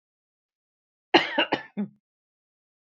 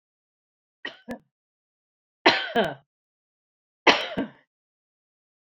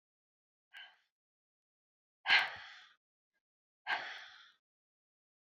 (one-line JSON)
{"cough_length": "2.9 s", "cough_amplitude": 25647, "cough_signal_mean_std_ratio": 0.26, "three_cough_length": "5.5 s", "three_cough_amplitude": 24251, "three_cough_signal_mean_std_ratio": 0.25, "exhalation_length": "5.5 s", "exhalation_amplitude": 5443, "exhalation_signal_mean_std_ratio": 0.22, "survey_phase": "beta (2021-08-13 to 2022-03-07)", "age": "45-64", "gender": "Female", "wearing_mask": "No", "symptom_none": true, "smoker_status": "Never smoked", "respiratory_condition_asthma": false, "respiratory_condition_other": false, "recruitment_source": "REACT", "submission_delay": "2 days", "covid_test_result": "Negative", "covid_test_method": "RT-qPCR"}